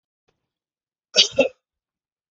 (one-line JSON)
{"cough_length": "2.3 s", "cough_amplitude": 29840, "cough_signal_mean_std_ratio": 0.22, "survey_phase": "beta (2021-08-13 to 2022-03-07)", "age": "45-64", "gender": "Male", "wearing_mask": "No", "symptom_cough_any": true, "symptom_runny_or_blocked_nose": true, "symptom_sore_throat": true, "symptom_onset": "8 days", "smoker_status": "Ex-smoker", "respiratory_condition_asthma": false, "respiratory_condition_other": false, "recruitment_source": "REACT", "submission_delay": "1 day", "covid_test_result": "Negative", "covid_test_method": "RT-qPCR"}